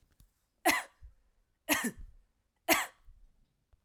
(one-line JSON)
{"three_cough_length": "3.8 s", "three_cough_amplitude": 9621, "three_cough_signal_mean_std_ratio": 0.31, "survey_phase": "alpha (2021-03-01 to 2021-08-12)", "age": "18-44", "gender": "Female", "wearing_mask": "No", "symptom_none": true, "symptom_onset": "3 days", "smoker_status": "Never smoked", "respiratory_condition_asthma": false, "respiratory_condition_other": false, "recruitment_source": "REACT", "submission_delay": "2 days", "covid_test_result": "Negative", "covid_test_method": "RT-qPCR"}